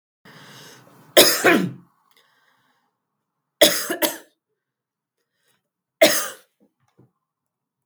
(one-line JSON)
{"three_cough_length": "7.9 s", "three_cough_amplitude": 32768, "three_cough_signal_mean_std_ratio": 0.28, "survey_phase": "beta (2021-08-13 to 2022-03-07)", "age": "45-64", "gender": "Female", "wearing_mask": "No", "symptom_headache": true, "smoker_status": "Ex-smoker", "respiratory_condition_asthma": false, "respiratory_condition_other": false, "recruitment_source": "REACT", "submission_delay": "4 days", "covid_test_result": "Negative", "covid_test_method": "RT-qPCR", "influenza_a_test_result": "Unknown/Void", "influenza_b_test_result": "Unknown/Void"}